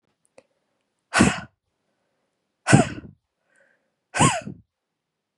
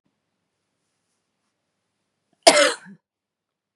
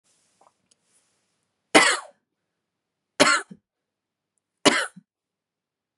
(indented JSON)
{
  "exhalation_length": "5.4 s",
  "exhalation_amplitude": 32663,
  "exhalation_signal_mean_std_ratio": 0.27,
  "cough_length": "3.8 s",
  "cough_amplitude": 32768,
  "cough_signal_mean_std_ratio": 0.19,
  "three_cough_length": "6.0 s",
  "three_cough_amplitude": 32635,
  "three_cough_signal_mean_std_ratio": 0.24,
  "survey_phase": "beta (2021-08-13 to 2022-03-07)",
  "age": "18-44",
  "gender": "Female",
  "wearing_mask": "No",
  "symptom_cough_any": true,
  "symptom_shortness_of_breath": true,
  "symptom_abdominal_pain": true,
  "symptom_fatigue": true,
  "symptom_change_to_sense_of_smell_or_taste": true,
  "symptom_loss_of_taste": true,
  "symptom_other": true,
  "symptom_onset": "12 days",
  "smoker_status": "Never smoked",
  "respiratory_condition_asthma": false,
  "respiratory_condition_other": true,
  "recruitment_source": "REACT",
  "submission_delay": "3 days",
  "covid_test_result": "Positive",
  "covid_test_method": "RT-qPCR",
  "covid_ct_value": 36.0,
  "covid_ct_gene": "N gene",
  "influenza_a_test_result": "Negative",
  "influenza_b_test_result": "Negative"
}